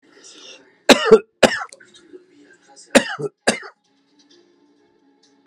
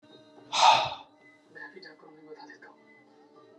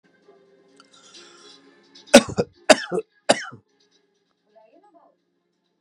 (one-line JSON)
{"cough_length": "5.5 s", "cough_amplitude": 32768, "cough_signal_mean_std_ratio": 0.25, "exhalation_length": "3.6 s", "exhalation_amplitude": 16386, "exhalation_signal_mean_std_ratio": 0.3, "three_cough_length": "5.8 s", "three_cough_amplitude": 32768, "three_cough_signal_mean_std_ratio": 0.18, "survey_phase": "beta (2021-08-13 to 2022-03-07)", "age": "65+", "gender": "Male", "wearing_mask": "No", "symptom_none": true, "smoker_status": "Never smoked", "respiratory_condition_asthma": false, "respiratory_condition_other": false, "recruitment_source": "REACT", "submission_delay": "1 day", "covid_test_result": "Negative", "covid_test_method": "RT-qPCR", "influenza_a_test_result": "Negative", "influenza_b_test_result": "Negative"}